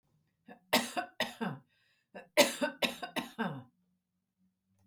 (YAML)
cough_length: 4.9 s
cough_amplitude: 11304
cough_signal_mean_std_ratio: 0.35
survey_phase: beta (2021-08-13 to 2022-03-07)
age: 65+
gender: Female
wearing_mask: 'No'
symptom_none: true
smoker_status: Never smoked
respiratory_condition_asthma: false
respiratory_condition_other: false
recruitment_source: REACT
submission_delay: 2 days
covid_test_result: Negative
covid_test_method: RT-qPCR
influenza_a_test_result: Unknown/Void
influenza_b_test_result: Unknown/Void